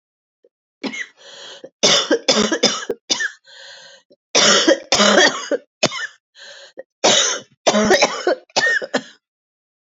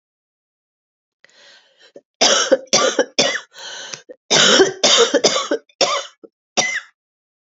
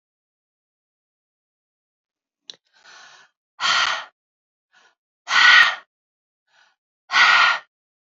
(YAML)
three_cough_length: 10.0 s
three_cough_amplitude: 32549
three_cough_signal_mean_std_ratio: 0.5
cough_length: 7.4 s
cough_amplitude: 32767
cough_signal_mean_std_ratio: 0.46
exhalation_length: 8.1 s
exhalation_amplitude: 28060
exhalation_signal_mean_std_ratio: 0.31
survey_phase: beta (2021-08-13 to 2022-03-07)
age: 45-64
gender: Female
wearing_mask: 'No'
symptom_cough_any: true
symptom_runny_or_blocked_nose: true
symptom_sore_throat: true
symptom_fatigue: true
symptom_fever_high_temperature: true
symptom_headache: true
symptom_other: true
symptom_onset: 3 days
smoker_status: Never smoked
respiratory_condition_asthma: false
respiratory_condition_other: false
recruitment_source: Test and Trace
submission_delay: 2 days
covid_test_result: Positive
covid_test_method: RT-qPCR
covid_ct_value: 19.7
covid_ct_gene: N gene
covid_ct_mean: 20.2
covid_viral_load: 230000 copies/ml
covid_viral_load_category: Low viral load (10K-1M copies/ml)